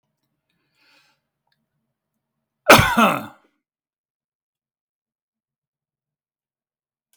{"cough_length": "7.2 s", "cough_amplitude": 32768, "cough_signal_mean_std_ratio": 0.19, "survey_phase": "beta (2021-08-13 to 2022-03-07)", "age": "65+", "gender": "Male", "wearing_mask": "No", "symptom_fatigue": true, "smoker_status": "Ex-smoker", "respiratory_condition_asthma": false, "respiratory_condition_other": false, "recruitment_source": "REACT", "submission_delay": "2 days", "covid_test_result": "Negative", "covid_test_method": "RT-qPCR", "influenza_a_test_result": "Negative", "influenza_b_test_result": "Negative"}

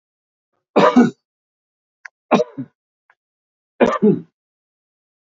{"three_cough_length": "5.4 s", "three_cough_amplitude": 27934, "three_cough_signal_mean_std_ratio": 0.3, "survey_phase": "beta (2021-08-13 to 2022-03-07)", "age": "65+", "gender": "Male", "wearing_mask": "No", "symptom_none": true, "smoker_status": "Ex-smoker", "respiratory_condition_asthma": false, "respiratory_condition_other": false, "recruitment_source": "REACT", "submission_delay": "1 day", "covid_test_result": "Negative", "covid_test_method": "RT-qPCR", "influenza_a_test_result": "Negative", "influenza_b_test_result": "Negative"}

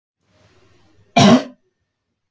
{"cough_length": "2.3 s", "cough_amplitude": 29380, "cough_signal_mean_std_ratio": 0.28, "survey_phase": "beta (2021-08-13 to 2022-03-07)", "age": "45-64", "gender": "Female", "wearing_mask": "No", "symptom_none": true, "smoker_status": "Never smoked", "respiratory_condition_asthma": false, "respiratory_condition_other": false, "recruitment_source": "REACT", "submission_delay": "4 days", "covid_test_result": "Negative", "covid_test_method": "RT-qPCR"}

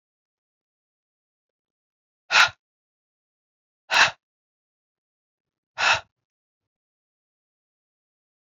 {"exhalation_length": "8.5 s", "exhalation_amplitude": 22493, "exhalation_signal_mean_std_ratio": 0.19, "survey_phase": "beta (2021-08-13 to 2022-03-07)", "age": "45-64", "gender": "Female", "wearing_mask": "No", "symptom_runny_or_blocked_nose": true, "symptom_sore_throat": true, "symptom_other": true, "smoker_status": "Ex-smoker", "respiratory_condition_asthma": false, "respiratory_condition_other": false, "recruitment_source": "Test and Trace", "submission_delay": "1 day", "covid_test_result": "Positive", "covid_test_method": "RT-qPCR", "covid_ct_value": 23.3, "covid_ct_gene": "N gene"}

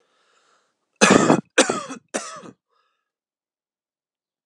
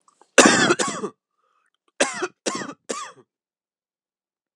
{"three_cough_length": "4.5 s", "three_cough_amplitude": 32768, "three_cough_signal_mean_std_ratio": 0.28, "cough_length": "4.6 s", "cough_amplitude": 32768, "cough_signal_mean_std_ratio": 0.32, "survey_phase": "alpha (2021-03-01 to 2021-08-12)", "age": "18-44", "gender": "Male", "wearing_mask": "No", "symptom_cough_any": true, "symptom_fever_high_temperature": true, "symptom_change_to_sense_of_smell_or_taste": true, "symptom_onset": "3 days", "smoker_status": "Never smoked", "respiratory_condition_asthma": false, "respiratory_condition_other": false, "recruitment_source": "Test and Trace", "submission_delay": "2 days", "covid_test_result": "Positive", "covid_test_method": "RT-qPCR", "covid_ct_value": 15.6, "covid_ct_gene": "N gene", "covid_ct_mean": 15.8, "covid_viral_load": "6500000 copies/ml", "covid_viral_load_category": "High viral load (>1M copies/ml)"}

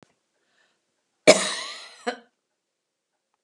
{"cough_length": "3.4 s", "cough_amplitude": 31323, "cough_signal_mean_std_ratio": 0.2, "survey_phase": "beta (2021-08-13 to 2022-03-07)", "age": "65+", "gender": "Female", "wearing_mask": "No", "symptom_none": true, "smoker_status": "Never smoked", "respiratory_condition_asthma": false, "respiratory_condition_other": false, "recruitment_source": "REACT", "submission_delay": "1 day", "covid_test_result": "Negative", "covid_test_method": "RT-qPCR"}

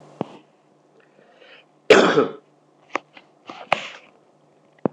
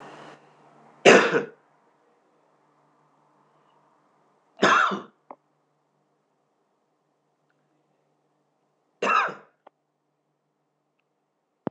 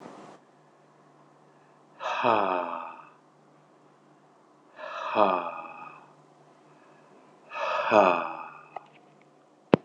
{"cough_length": "4.9 s", "cough_amplitude": 26028, "cough_signal_mean_std_ratio": 0.26, "three_cough_length": "11.7 s", "three_cough_amplitude": 26017, "three_cough_signal_mean_std_ratio": 0.22, "exhalation_length": "9.8 s", "exhalation_amplitude": 26028, "exhalation_signal_mean_std_ratio": 0.34, "survey_phase": "alpha (2021-03-01 to 2021-08-12)", "age": "45-64", "gender": "Male", "wearing_mask": "No", "symptom_none": true, "smoker_status": "Current smoker (e-cigarettes or vapes only)", "respiratory_condition_asthma": false, "respiratory_condition_other": false, "recruitment_source": "REACT", "submission_delay": "2 days", "covid_test_result": "Negative", "covid_test_method": "RT-qPCR"}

